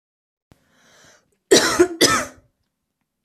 cough_length: 3.2 s
cough_amplitude: 31605
cough_signal_mean_std_ratio: 0.33
survey_phase: beta (2021-08-13 to 2022-03-07)
age: 18-44
gender: Female
wearing_mask: 'No'
symptom_sore_throat: true
symptom_fatigue: true
symptom_onset: 2 days
smoker_status: Ex-smoker
respiratory_condition_asthma: false
respiratory_condition_other: false
recruitment_source: Test and Trace
submission_delay: 1 day
covid_test_result: Positive
covid_test_method: RT-qPCR
covid_ct_value: 22.0
covid_ct_gene: ORF1ab gene
covid_ct_mean: 22.7
covid_viral_load: 37000 copies/ml
covid_viral_load_category: Low viral load (10K-1M copies/ml)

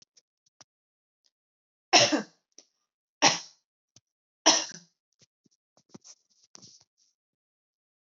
three_cough_length: 8.0 s
three_cough_amplitude: 18104
three_cough_signal_mean_std_ratio: 0.2
survey_phase: beta (2021-08-13 to 2022-03-07)
age: 18-44
gender: Female
wearing_mask: 'No'
symptom_none: true
smoker_status: Never smoked
respiratory_condition_asthma: false
respiratory_condition_other: false
recruitment_source: REACT
submission_delay: 1 day
covid_test_result: Negative
covid_test_method: RT-qPCR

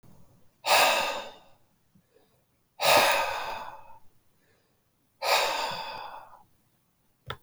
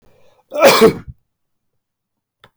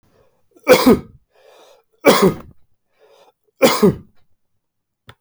exhalation_length: 7.4 s
exhalation_amplitude: 15161
exhalation_signal_mean_std_ratio: 0.42
cough_length: 2.6 s
cough_amplitude: 32421
cough_signal_mean_std_ratio: 0.32
three_cough_length: 5.2 s
three_cough_amplitude: 31892
three_cough_signal_mean_std_ratio: 0.33
survey_phase: alpha (2021-03-01 to 2021-08-12)
age: 45-64
gender: Male
wearing_mask: 'No'
symptom_none: true
smoker_status: Never smoked
respiratory_condition_asthma: true
respiratory_condition_other: false
recruitment_source: REACT
submission_delay: 3 days
covid_test_result: Negative
covid_test_method: RT-qPCR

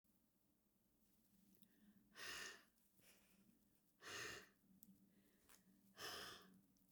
exhalation_length: 6.9 s
exhalation_amplitude: 374
exhalation_signal_mean_std_ratio: 0.49
survey_phase: beta (2021-08-13 to 2022-03-07)
age: 65+
gender: Female
wearing_mask: 'No'
symptom_fatigue: true
symptom_headache: true
smoker_status: Never smoked
respiratory_condition_asthma: false
respiratory_condition_other: false
recruitment_source: REACT
submission_delay: 1 day
covid_test_result: Negative
covid_test_method: RT-qPCR
influenza_a_test_result: Negative
influenza_b_test_result: Negative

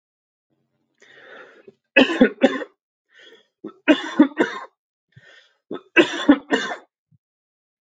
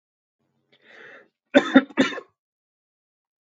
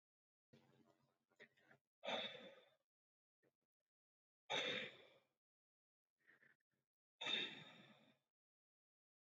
three_cough_length: 7.9 s
three_cough_amplitude: 30695
three_cough_signal_mean_std_ratio: 0.3
cough_length: 3.5 s
cough_amplitude: 32340
cough_signal_mean_std_ratio: 0.22
exhalation_length: 9.2 s
exhalation_amplitude: 920
exhalation_signal_mean_std_ratio: 0.3
survey_phase: alpha (2021-03-01 to 2021-08-12)
age: 18-44
gender: Male
wearing_mask: 'No'
symptom_none: true
smoker_status: Never smoked
respiratory_condition_asthma: false
respiratory_condition_other: false
recruitment_source: REACT
submission_delay: 2 days
covid_test_result: Negative
covid_test_method: RT-qPCR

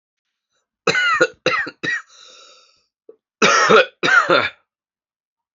cough_length: 5.5 s
cough_amplitude: 32767
cough_signal_mean_std_ratio: 0.44
survey_phase: beta (2021-08-13 to 2022-03-07)
age: 45-64
gender: Male
wearing_mask: 'No'
symptom_cough_any: true
symptom_sore_throat: true
symptom_fever_high_temperature: true
symptom_headache: true
symptom_change_to_sense_of_smell_or_taste: true
smoker_status: Ex-smoker
respiratory_condition_asthma: true
respiratory_condition_other: false
recruitment_source: Test and Trace
submission_delay: 2 days
covid_test_result: Positive
covid_test_method: RT-qPCR
covid_ct_value: 16.8
covid_ct_gene: ORF1ab gene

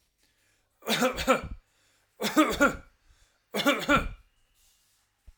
three_cough_length: 5.4 s
three_cough_amplitude: 12863
three_cough_signal_mean_std_ratio: 0.41
survey_phase: alpha (2021-03-01 to 2021-08-12)
age: 45-64
gender: Male
wearing_mask: 'No'
symptom_none: true
smoker_status: Ex-smoker
respiratory_condition_asthma: false
respiratory_condition_other: false
recruitment_source: REACT
submission_delay: 3 days
covid_test_result: Negative
covid_test_method: RT-qPCR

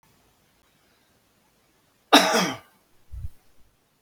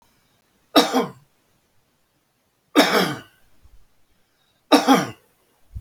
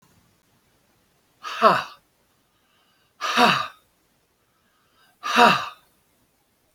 cough_length: 4.0 s
cough_amplitude: 28418
cough_signal_mean_std_ratio: 0.25
three_cough_length: 5.8 s
three_cough_amplitude: 28439
three_cough_signal_mean_std_ratio: 0.32
exhalation_length: 6.7 s
exhalation_amplitude: 27200
exhalation_signal_mean_std_ratio: 0.3
survey_phase: beta (2021-08-13 to 2022-03-07)
age: 65+
gender: Male
wearing_mask: 'No'
symptom_cough_any: true
symptom_runny_or_blocked_nose: true
symptom_abdominal_pain: true
symptom_fatigue: true
symptom_onset: 12 days
smoker_status: Ex-smoker
respiratory_condition_asthma: true
respiratory_condition_other: false
recruitment_source: REACT
submission_delay: 0 days
covid_test_result: Negative
covid_test_method: RT-qPCR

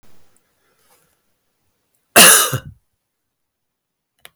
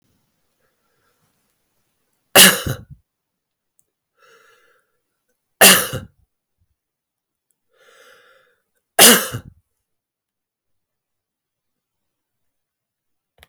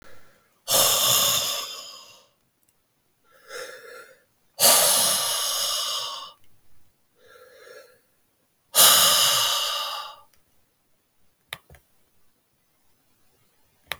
cough_length: 4.4 s
cough_amplitude: 32768
cough_signal_mean_std_ratio: 0.24
three_cough_length: 13.5 s
three_cough_amplitude: 32768
three_cough_signal_mean_std_ratio: 0.19
exhalation_length: 14.0 s
exhalation_amplitude: 29075
exhalation_signal_mean_std_ratio: 0.43
survey_phase: alpha (2021-03-01 to 2021-08-12)
age: 65+
gender: Male
wearing_mask: 'No'
symptom_none: true
smoker_status: Never smoked
respiratory_condition_asthma: false
respiratory_condition_other: false
recruitment_source: REACT
submission_delay: 4 days
covid_test_result: Negative
covid_test_method: RT-qPCR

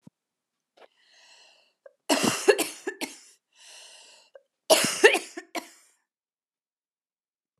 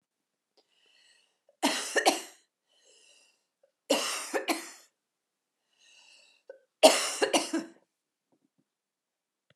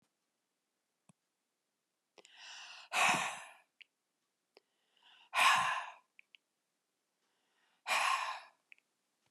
cough_length: 7.6 s
cough_amplitude: 25407
cough_signal_mean_std_ratio: 0.27
three_cough_length: 9.6 s
three_cough_amplitude: 19987
three_cough_signal_mean_std_ratio: 0.29
exhalation_length: 9.3 s
exhalation_amplitude: 5669
exhalation_signal_mean_std_ratio: 0.32
survey_phase: beta (2021-08-13 to 2022-03-07)
age: 65+
gender: Female
wearing_mask: 'No'
symptom_none: true
smoker_status: Never smoked
respiratory_condition_asthma: false
respiratory_condition_other: false
recruitment_source: Test and Trace
submission_delay: 2 days
covid_test_result: Negative
covid_test_method: RT-qPCR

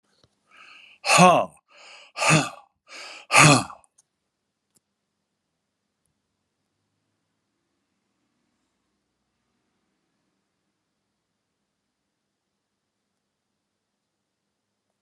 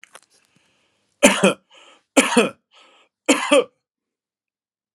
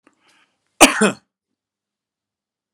exhalation_length: 15.0 s
exhalation_amplitude: 29381
exhalation_signal_mean_std_ratio: 0.2
three_cough_length: 4.9 s
three_cough_amplitude: 32767
three_cough_signal_mean_std_ratio: 0.31
cough_length: 2.7 s
cough_amplitude: 32768
cough_signal_mean_std_ratio: 0.21
survey_phase: alpha (2021-03-01 to 2021-08-12)
age: 65+
gender: Male
wearing_mask: 'No'
symptom_none: true
smoker_status: Never smoked
respiratory_condition_asthma: false
respiratory_condition_other: false
recruitment_source: REACT
submission_delay: 1 day
covid_test_result: Negative
covid_test_method: RT-qPCR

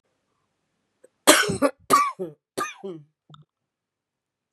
three_cough_length: 4.5 s
three_cough_amplitude: 32767
three_cough_signal_mean_std_ratio: 0.3
survey_phase: beta (2021-08-13 to 2022-03-07)
age: 45-64
gender: Female
wearing_mask: 'No'
symptom_cough_any: true
symptom_runny_or_blocked_nose: true
symptom_sore_throat: true
symptom_headache: true
symptom_change_to_sense_of_smell_or_taste: true
symptom_loss_of_taste: true
symptom_onset: 4 days
smoker_status: Never smoked
respiratory_condition_asthma: false
respiratory_condition_other: false
recruitment_source: Test and Trace
submission_delay: 1 day
covid_test_result: Positive
covid_test_method: RT-qPCR
covid_ct_value: 20.1
covid_ct_gene: ORF1ab gene
covid_ct_mean: 20.5
covid_viral_load: 180000 copies/ml
covid_viral_load_category: Low viral load (10K-1M copies/ml)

